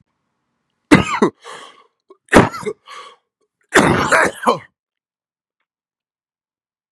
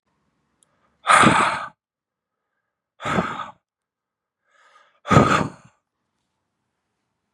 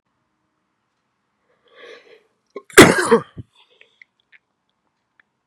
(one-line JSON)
{"three_cough_length": "6.9 s", "three_cough_amplitude": 32768, "three_cough_signal_mean_std_ratio": 0.32, "exhalation_length": "7.3 s", "exhalation_amplitude": 32767, "exhalation_signal_mean_std_ratio": 0.3, "cough_length": "5.5 s", "cough_amplitude": 32768, "cough_signal_mean_std_ratio": 0.19, "survey_phase": "beta (2021-08-13 to 2022-03-07)", "age": "18-44", "gender": "Male", "wearing_mask": "No", "symptom_cough_any": true, "symptom_runny_or_blocked_nose": true, "symptom_abdominal_pain": true, "symptom_fever_high_temperature": true, "symptom_headache": true, "symptom_onset": "3 days", "smoker_status": "Current smoker (1 to 10 cigarettes per day)", "respiratory_condition_asthma": false, "respiratory_condition_other": false, "recruitment_source": "Test and Trace", "submission_delay": "1 day", "covid_test_result": "Positive", "covid_test_method": "RT-qPCR", "covid_ct_value": 18.5, "covid_ct_gene": "ORF1ab gene", "covid_ct_mean": 18.6, "covid_viral_load": "820000 copies/ml", "covid_viral_load_category": "Low viral load (10K-1M copies/ml)"}